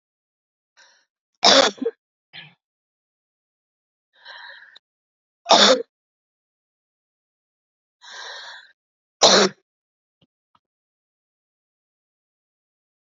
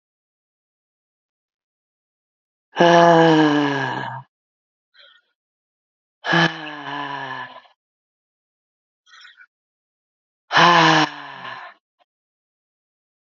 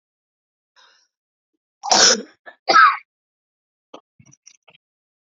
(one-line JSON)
{"three_cough_length": "13.1 s", "three_cough_amplitude": 31715, "three_cough_signal_mean_std_ratio": 0.21, "exhalation_length": "13.2 s", "exhalation_amplitude": 28614, "exhalation_signal_mean_std_ratio": 0.33, "cough_length": "5.3 s", "cough_amplitude": 30179, "cough_signal_mean_std_ratio": 0.26, "survey_phase": "alpha (2021-03-01 to 2021-08-12)", "age": "18-44", "gender": "Female", "wearing_mask": "No", "symptom_abdominal_pain": true, "symptom_diarrhoea": true, "symptom_fatigue": true, "symptom_fever_high_temperature": true, "symptom_headache": true, "symptom_change_to_sense_of_smell_or_taste": true, "symptom_loss_of_taste": true, "symptom_onset": "4 days", "smoker_status": "Current smoker (11 or more cigarettes per day)", "respiratory_condition_asthma": false, "respiratory_condition_other": false, "recruitment_source": "Test and Trace", "submission_delay": "2 days", "covid_test_result": "Positive", "covid_test_method": "RT-qPCR"}